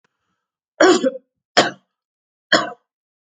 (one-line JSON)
{"three_cough_length": "3.3 s", "three_cough_amplitude": 31066, "three_cough_signal_mean_std_ratio": 0.31, "survey_phase": "alpha (2021-03-01 to 2021-08-12)", "age": "65+", "gender": "Female", "wearing_mask": "No", "symptom_none": true, "smoker_status": "Never smoked", "respiratory_condition_asthma": true, "respiratory_condition_other": false, "recruitment_source": "REACT", "submission_delay": "1 day", "covid_test_result": "Negative", "covid_test_method": "RT-qPCR"}